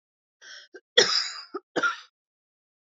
{"cough_length": "3.0 s", "cough_amplitude": 28686, "cough_signal_mean_std_ratio": 0.32, "survey_phase": "beta (2021-08-13 to 2022-03-07)", "age": "45-64", "gender": "Female", "wearing_mask": "No", "symptom_cough_any": true, "symptom_fatigue": true, "symptom_change_to_sense_of_smell_or_taste": true, "symptom_loss_of_taste": true, "symptom_onset": "8 days", "smoker_status": "Never smoked", "respiratory_condition_asthma": false, "respiratory_condition_other": false, "recruitment_source": "Test and Trace", "submission_delay": "2 days", "covid_test_result": "Positive", "covid_test_method": "RT-qPCR", "covid_ct_value": 15.0, "covid_ct_gene": "ORF1ab gene", "covid_ct_mean": 15.3, "covid_viral_load": "9900000 copies/ml", "covid_viral_load_category": "High viral load (>1M copies/ml)"}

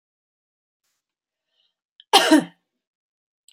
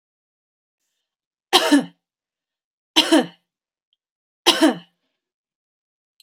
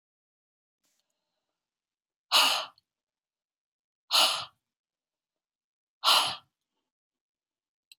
{"cough_length": "3.5 s", "cough_amplitude": 30276, "cough_signal_mean_std_ratio": 0.21, "three_cough_length": "6.2 s", "three_cough_amplitude": 32768, "three_cough_signal_mean_std_ratio": 0.27, "exhalation_length": "8.0 s", "exhalation_amplitude": 12616, "exhalation_signal_mean_std_ratio": 0.25, "survey_phase": "beta (2021-08-13 to 2022-03-07)", "age": "45-64", "gender": "Female", "wearing_mask": "No", "symptom_runny_or_blocked_nose": true, "symptom_onset": "3 days", "smoker_status": "Never smoked", "respiratory_condition_asthma": false, "respiratory_condition_other": false, "recruitment_source": "Test and Trace", "submission_delay": "2 days", "covid_test_result": "Positive", "covid_test_method": "RT-qPCR", "covid_ct_value": 17.4, "covid_ct_gene": "ORF1ab gene", "covid_ct_mean": 18.3, "covid_viral_load": "990000 copies/ml", "covid_viral_load_category": "Low viral load (10K-1M copies/ml)"}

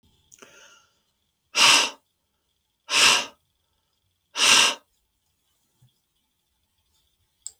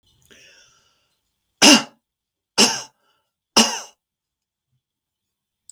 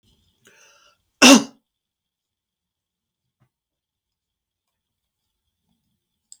{"exhalation_length": "7.6 s", "exhalation_amplitude": 25104, "exhalation_signal_mean_std_ratio": 0.29, "three_cough_length": "5.7 s", "three_cough_amplitude": 32768, "three_cough_signal_mean_std_ratio": 0.23, "cough_length": "6.4 s", "cough_amplitude": 32766, "cough_signal_mean_std_ratio": 0.14, "survey_phase": "beta (2021-08-13 to 2022-03-07)", "age": "65+", "gender": "Male", "wearing_mask": "No", "symptom_none": true, "smoker_status": "Never smoked", "respiratory_condition_asthma": false, "respiratory_condition_other": false, "recruitment_source": "REACT", "submission_delay": "1 day", "covid_test_result": "Negative", "covid_test_method": "RT-qPCR", "influenza_a_test_result": "Negative", "influenza_b_test_result": "Negative"}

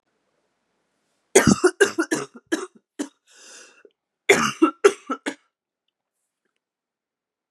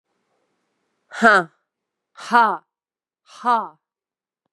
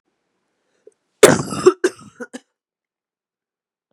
{"three_cough_length": "7.5 s", "three_cough_amplitude": 30759, "three_cough_signal_mean_std_ratio": 0.28, "exhalation_length": "4.5 s", "exhalation_amplitude": 32737, "exhalation_signal_mean_std_ratio": 0.29, "cough_length": "3.9 s", "cough_amplitude": 32768, "cough_signal_mean_std_ratio": 0.22, "survey_phase": "beta (2021-08-13 to 2022-03-07)", "age": "18-44", "gender": "Female", "wearing_mask": "No", "symptom_cough_any": true, "symptom_runny_or_blocked_nose": true, "symptom_sore_throat": true, "symptom_fatigue": true, "symptom_headache": true, "symptom_onset": "3 days", "smoker_status": "Never smoked", "respiratory_condition_asthma": false, "respiratory_condition_other": false, "recruitment_source": "Test and Trace", "submission_delay": "1 day", "covid_test_result": "Positive", "covid_test_method": "RT-qPCR", "covid_ct_value": 30.4, "covid_ct_gene": "N gene"}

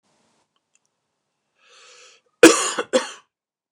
{"cough_length": "3.7 s", "cough_amplitude": 29204, "cough_signal_mean_std_ratio": 0.22, "survey_phase": "beta (2021-08-13 to 2022-03-07)", "age": "45-64", "gender": "Male", "wearing_mask": "No", "symptom_none": true, "smoker_status": "Never smoked", "respiratory_condition_asthma": false, "respiratory_condition_other": false, "recruitment_source": "REACT", "submission_delay": "7 days", "covid_test_result": "Negative", "covid_test_method": "RT-qPCR"}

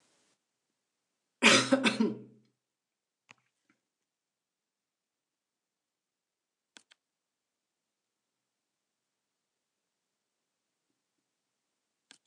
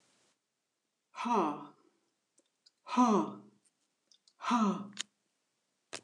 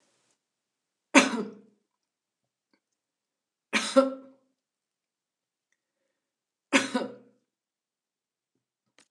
{"cough_length": "12.3 s", "cough_amplitude": 13524, "cough_signal_mean_std_ratio": 0.16, "exhalation_length": "6.0 s", "exhalation_amplitude": 5437, "exhalation_signal_mean_std_ratio": 0.35, "three_cough_length": "9.1 s", "three_cough_amplitude": 28937, "three_cough_signal_mean_std_ratio": 0.21, "survey_phase": "beta (2021-08-13 to 2022-03-07)", "age": "45-64", "gender": "Female", "wearing_mask": "No", "symptom_none": true, "smoker_status": "Never smoked", "respiratory_condition_asthma": false, "respiratory_condition_other": false, "recruitment_source": "REACT", "submission_delay": "1 day", "covid_test_result": "Negative", "covid_test_method": "RT-qPCR"}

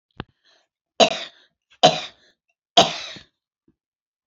{"three_cough_length": "4.3 s", "three_cough_amplitude": 30234, "three_cough_signal_mean_std_ratio": 0.24, "survey_phase": "beta (2021-08-13 to 2022-03-07)", "age": "65+", "gender": "Female", "wearing_mask": "No", "symptom_none": true, "smoker_status": "Never smoked", "respiratory_condition_asthma": true, "respiratory_condition_other": false, "recruitment_source": "REACT", "submission_delay": "2 days", "covid_test_result": "Negative", "covid_test_method": "RT-qPCR", "influenza_a_test_result": "Negative", "influenza_b_test_result": "Negative"}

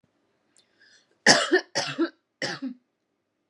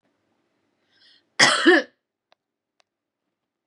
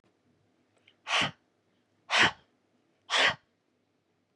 {"three_cough_length": "3.5 s", "three_cough_amplitude": 27354, "three_cough_signal_mean_std_ratio": 0.33, "cough_length": "3.7 s", "cough_amplitude": 31803, "cough_signal_mean_std_ratio": 0.26, "exhalation_length": "4.4 s", "exhalation_amplitude": 10520, "exhalation_signal_mean_std_ratio": 0.3, "survey_phase": "beta (2021-08-13 to 2022-03-07)", "age": "18-44", "gender": "Female", "wearing_mask": "No", "symptom_none": true, "smoker_status": "Current smoker (11 or more cigarettes per day)", "respiratory_condition_asthma": false, "respiratory_condition_other": false, "recruitment_source": "Test and Trace", "submission_delay": "0 days", "covid_test_result": "Negative", "covid_test_method": "LFT"}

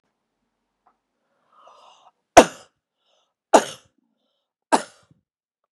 {"three_cough_length": "5.7 s", "three_cough_amplitude": 32768, "three_cough_signal_mean_std_ratio": 0.15, "survey_phase": "beta (2021-08-13 to 2022-03-07)", "age": "65+", "gender": "Female", "wearing_mask": "No", "symptom_runny_or_blocked_nose": true, "smoker_status": "Ex-smoker", "respiratory_condition_asthma": false, "respiratory_condition_other": false, "recruitment_source": "REACT", "submission_delay": "1 day", "covid_test_result": "Negative", "covid_test_method": "RT-qPCR", "influenza_a_test_result": "Negative", "influenza_b_test_result": "Negative"}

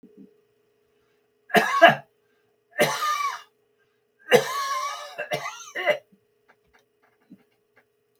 {"three_cough_length": "8.2 s", "three_cough_amplitude": 32468, "three_cough_signal_mean_std_ratio": 0.34, "survey_phase": "beta (2021-08-13 to 2022-03-07)", "age": "65+", "gender": "Male", "wearing_mask": "No", "symptom_none": true, "smoker_status": "Ex-smoker", "respiratory_condition_asthma": false, "respiratory_condition_other": false, "recruitment_source": "REACT", "submission_delay": "9 days", "covid_test_result": "Negative", "covid_test_method": "RT-qPCR"}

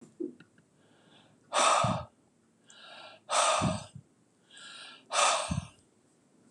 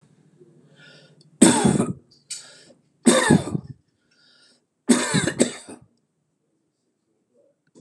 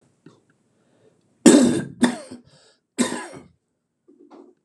{"exhalation_length": "6.5 s", "exhalation_amplitude": 7997, "exhalation_signal_mean_std_ratio": 0.43, "three_cough_length": "7.8 s", "three_cough_amplitude": 32768, "three_cough_signal_mean_std_ratio": 0.33, "cough_length": "4.6 s", "cough_amplitude": 32768, "cough_signal_mean_std_ratio": 0.29, "survey_phase": "beta (2021-08-13 to 2022-03-07)", "age": "65+", "gender": "Male", "wearing_mask": "No", "symptom_none": true, "symptom_onset": "12 days", "smoker_status": "Ex-smoker", "respiratory_condition_asthma": false, "respiratory_condition_other": false, "recruitment_source": "REACT", "submission_delay": "3 days", "covid_test_result": "Negative", "covid_test_method": "RT-qPCR", "influenza_a_test_result": "Negative", "influenza_b_test_result": "Negative"}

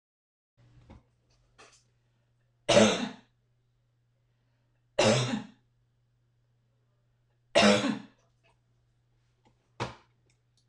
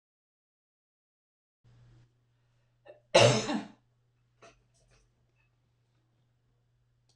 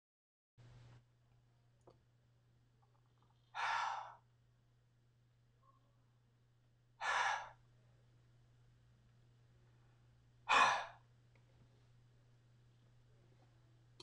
{"three_cough_length": "10.7 s", "three_cough_amplitude": 13443, "three_cough_signal_mean_std_ratio": 0.27, "cough_length": "7.2 s", "cough_amplitude": 11832, "cough_signal_mean_std_ratio": 0.19, "exhalation_length": "14.0 s", "exhalation_amplitude": 3800, "exhalation_signal_mean_std_ratio": 0.27, "survey_phase": "beta (2021-08-13 to 2022-03-07)", "age": "65+", "gender": "Female", "wearing_mask": "No", "symptom_none": true, "smoker_status": "Never smoked", "respiratory_condition_asthma": true, "respiratory_condition_other": false, "recruitment_source": "REACT", "submission_delay": "4 days", "covid_test_result": "Negative", "covid_test_method": "RT-qPCR"}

